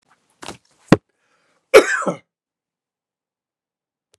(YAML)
cough_length: 4.2 s
cough_amplitude: 32768
cough_signal_mean_std_ratio: 0.19
survey_phase: beta (2021-08-13 to 2022-03-07)
age: 65+
gender: Male
wearing_mask: 'No'
symptom_runny_or_blocked_nose: true
symptom_change_to_sense_of_smell_or_taste: true
symptom_other: true
smoker_status: Never smoked
respiratory_condition_asthma: false
respiratory_condition_other: false
recruitment_source: Test and Trace
submission_delay: 1 day
covid_test_result: Positive
covid_test_method: RT-qPCR
covid_ct_value: 21.8
covid_ct_gene: ORF1ab gene
covid_ct_mean: 22.4
covid_viral_load: 46000 copies/ml
covid_viral_load_category: Low viral load (10K-1M copies/ml)